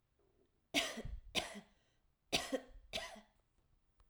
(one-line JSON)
{"cough_length": "4.1 s", "cough_amplitude": 3455, "cough_signal_mean_std_ratio": 0.39, "survey_phase": "alpha (2021-03-01 to 2021-08-12)", "age": "18-44", "gender": "Female", "wearing_mask": "No", "symptom_none": true, "smoker_status": "Never smoked", "respiratory_condition_asthma": false, "respiratory_condition_other": false, "recruitment_source": "REACT", "submission_delay": "1 day", "covid_test_result": "Negative", "covid_test_method": "RT-qPCR"}